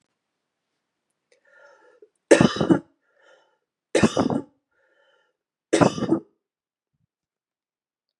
{"three_cough_length": "8.2 s", "three_cough_amplitude": 30389, "three_cough_signal_mean_std_ratio": 0.26, "survey_phase": "beta (2021-08-13 to 2022-03-07)", "age": "18-44", "gender": "Male", "wearing_mask": "No", "symptom_runny_or_blocked_nose": true, "symptom_fatigue": true, "symptom_onset": "5 days", "smoker_status": "Ex-smoker", "respiratory_condition_asthma": false, "respiratory_condition_other": false, "recruitment_source": "Test and Trace", "submission_delay": "2 days", "covid_test_result": "Positive", "covid_test_method": "ePCR"}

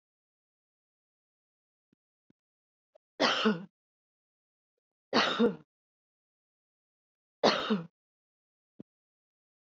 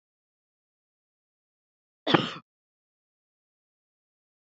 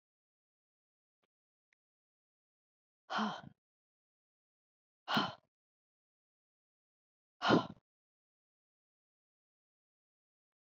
{"three_cough_length": "9.6 s", "three_cough_amplitude": 11122, "three_cough_signal_mean_std_ratio": 0.26, "cough_length": "4.5 s", "cough_amplitude": 21087, "cough_signal_mean_std_ratio": 0.15, "exhalation_length": "10.7 s", "exhalation_amplitude": 5410, "exhalation_signal_mean_std_ratio": 0.18, "survey_phase": "alpha (2021-03-01 to 2021-08-12)", "age": "65+", "gender": "Female", "wearing_mask": "No", "symptom_fatigue": true, "symptom_headache": true, "symptom_onset": "12 days", "smoker_status": "Ex-smoker", "respiratory_condition_asthma": false, "respiratory_condition_other": false, "recruitment_source": "REACT", "submission_delay": "1 day", "covid_test_result": "Negative", "covid_test_method": "RT-qPCR"}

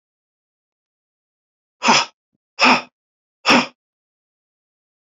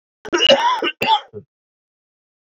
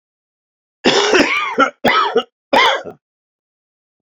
{"exhalation_length": "5.0 s", "exhalation_amplitude": 30163, "exhalation_signal_mean_std_ratio": 0.27, "cough_length": "2.6 s", "cough_amplitude": 26660, "cough_signal_mean_std_ratio": 0.44, "three_cough_length": "4.0 s", "three_cough_amplitude": 32253, "three_cough_signal_mean_std_ratio": 0.5, "survey_phase": "alpha (2021-03-01 to 2021-08-12)", "age": "65+", "gender": "Male", "wearing_mask": "No", "symptom_none": true, "symptom_fatigue": true, "smoker_status": "Ex-smoker", "respiratory_condition_asthma": false, "respiratory_condition_other": false, "recruitment_source": "REACT", "submission_delay": "1 day", "covid_test_result": "Negative", "covid_test_method": "RT-qPCR"}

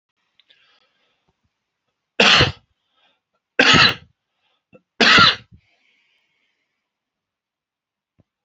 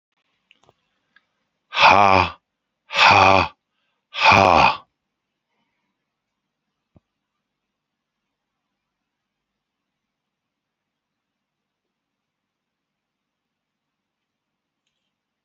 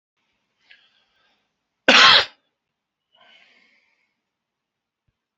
{"three_cough_length": "8.4 s", "three_cough_amplitude": 30787, "three_cough_signal_mean_std_ratio": 0.27, "exhalation_length": "15.4 s", "exhalation_amplitude": 32768, "exhalation_signal_mean_std_ratio": 0.24, "cough_length": "5.4 s", "cough_amplitude": 29667, "cough_signal_mean_std_ratio": 0.21, "survey_phase": "alpha (2021-03-01 to 2021-08-12)", "age": "65+", "gender": "Male", "wearing_mask": "No", "symptom_none": true, "smoker_status": "Current smoker (1 to 10 cigarettes per day)", "respiratory_condition_asthma": false, "respiratory_condition_other": true, "recruitment_source": "REACT", "submission_delay": "2 days", "covid_test_result": "Negative", "covid_test_method": "RT-qPCR"}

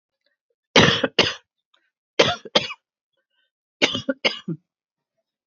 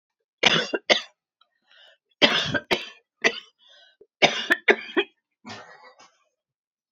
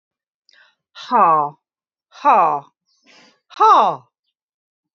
{"cough_length": "5.5 s", "cough_amplitude": 28608, "cough_signal_mean_std_ratio": 0.31, "three_cough_length": "6.9 s", "three_cough_amplitude": 29292, "three_cough_signal_mean_std_ratio": 0.33, "exhalation_length": "4.9 s", "exhalation_amplitude": 27749, "exhalation_signal_mean_std_ratio": 0.38, "survey_phase": "alpha (2021-03-01 to 2021-08-12)", "age": "45-64", "gender": "Female", "wearing_mask": "No", "symptom_none": true, "smoker_status": "Never smoked", "respiratory_condition_asthma": false, "respiratory_condition_other": false, "recruitment_source": "REACT", "submission_delay": "1 day", "covid_test_result": "Negative", "covid_test_method": "RT-qPCR"}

